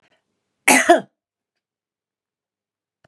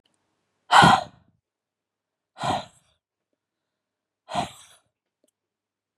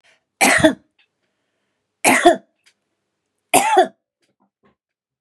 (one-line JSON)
{"cough_length": "3.1 s", "cough_amplitude": 32768, "cough_signal_mean_std_ratio": 0.24, "exhalation_length": "6.0 s", "exhalation_amplitude": 30481, "exhalation_signal_mean_std_ratio": 0.22, "three_cough_length": "5.2 s", "three_cough_amplitude": 32767, "three_cough_signal_mean_std_ratio": 0.33, "survey_phase": "beta (2021-08-13 to 2022-03-07)", "age": "45-64", "gender": "Female", "wearing_mask": "No", "symptom_none": true, "smoker_status": "Never smoked", "respiratory_condition_asthma": false, "respiratory_condition_other": false, "recruitment_source": "REACT", "submission_delay": "1 day", "covid_test_result": "Negative", "covid_test_method": "RT-qPCR", "influenza_a_test_result": "Negative", "influenza_b_test_result": "Negative"}